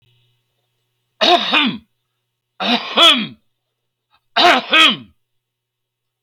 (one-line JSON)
{"three_cough_length": "6.2 s", "three_cough_amplitude": 30657, "three_cough_signal_mean_std_ratio": 0.39, "survey_phase": "beta (2021-08-13 to 2022-03-07)", "age": "65+", "gender": "Male", "wearing_mask": "No", "symptom_none": true, "smoker_status": "Never smoked", "respiratory_condition_asthma": false, "respiratory_condition_other": false, "recruitment_source": "REACT", "submission_delay": "2 days", "covid_test_result": "Negative", "covid_test_method": "RT-qPCR"}